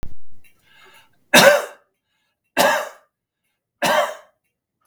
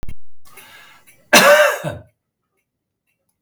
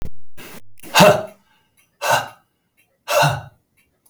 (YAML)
three_cough_length: 4.9 s
three_cough_amplitude: 32768
three_cough_signal_mean_std_ratio: 0.39
cough_length: 3.4 s
cough_amplitude: 32768
cough_signal_mean_std_ratio: 0.41
exhalation_length: 4.1 s
exhalation_amplitude: 32768
exhalation_signal_mean_std_ratio: 0.45
survey_phase: beta (2021-08-13 to 2022-03-07)
age: 65+
gender: Male
wearing_mask: 'No'
symptom_none: true
symptom_onset: 3 days
smoker_status: Never smoked
respiratory_condition_asthma: true
respiratory_condition_other: false
recruitment_source: REACT
submission_delay: 1 day
covid_test_result: Negative
covid_test_method: RT-qPCR